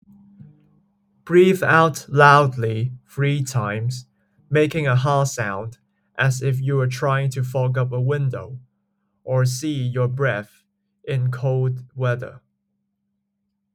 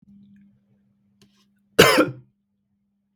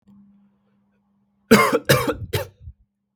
exhalation_length: 13.7 s
exhalation_amplitude: 32768
exhalation_signal_mean_std_ratio: 0.65
cough_length: 3.2 s
cough_amplitude: 32767
cough_signal_mean_std_ratio: 0.24
three_cough_length: 3.2 s
three_cough_amplitude: 32767
three_cough_signal_mean_std_ratio: 0.34
survey_phase: beta (2021-08-13 to 2022-03-07)
age: 18-44
gender: Male
wearing_mask: 'No'
symptom_none: true
smoker_status: Never smoked
respiratory_condition_asthma: false
respiratory_condition_other: false
recruitment_source: REACT
submission_delay: 1 day
covid_test_result: Negative
covid_test_method: RT-qPCR
influenza_a_test_result: Negative
influenza_b_test_result: Negative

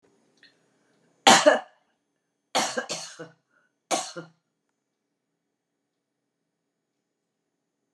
three_cough_length: 7.9 s
three_cough_amplitude: 29959
three_cough_signal_mean_std_ratio: 0.21
survey_phase: beta (2021-08-13 to 2022-03-07)
age: 65+
gender: Female
wearing_mask: 'No'
symptom_cough_any: true
smoker_status: Never smoked
respiratory_condition_asthma: false
respiratory_condition_other: false
recruitment_source: Test and Trace
submission_delay: 1 day
covid_test_result: Positive
covid_test_method: RT-qPCR
covid_ct_value: 22.7
covid_ct_gene: ORF1ab gene
covid_ct_mean: 23.5
covid_viral_load: 20000 copies/ml
covid_viral_load_category: Low viral load (10K-1M copies/ml)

